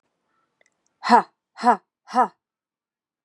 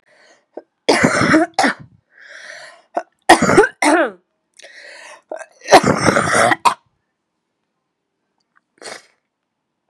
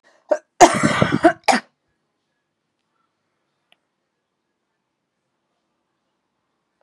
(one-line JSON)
{"exhalation_length": "3.2 s", "exhalation_amplitude": 29684, "exhalation_signal_mean_std_ratio": 0.26, "three_cough_length": "9.9 s", "three_cough_amplitude": 32768, "three_cough_signal_mean_std_ratio": 0.38, "cough_length": "6.8 s", "cough_amplitude": 32768, "cough_signal_mean_std_ratio": 0.23, "survey_phase": "beta (2021-08-13 to 2022-03-07)", "age": "18-44", "gender": "Female", "wearing_mask": "No", "symptom_cough_any": true, "symptom_runny_or_blocked_nose": true, "symptom_shortness_of_breath": true, "symptom_sore_throat": true, "symptom_fatigue": true, "symptom_fever_high_temperature": true, "symptom_headache": true, "symptom_other": true, "smoker_status": "Never smoked", "respiratory_condition_asthma": false, "respiratory_condition_other": false, "recruitment_source": "Test and Trace", "submission_delay": "2 days", "covid_test_result": "Positive", "covid_test_method": "LFT"}